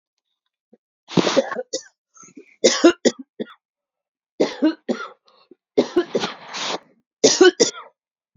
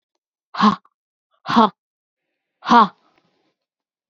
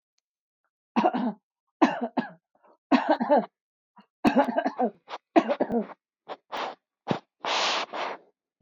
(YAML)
three_cough_length: 8.4 s
three_cough_amplitude: 28231
three_cough_signal_mean_std_ratio: 0.35
exhalation_length: 4.1 s
exhalation_amplitude: 31318
exhalation_signal_mean_std_ratio: 0.27
cough_length: 8.6 s
cough_amplitude: 19007
cough_signal_mean_std_ratio: 0.43
survey_phase: beta (2021-08-13 to 2022-03-07)
age: 45-64
gender: Female
wearing_mask: 'No'
symptom_none: true
smoker_status: Ex-smoker
respiratory_condition_asthma: false
respiratory_condition_other: false
recruitment_source: REACT
submission_delay: 3 days
covid_test_result: Negative
covid_test_method: RT-qPCR
influenza_a_test_result: Negative
influenza_b_test_result: Negative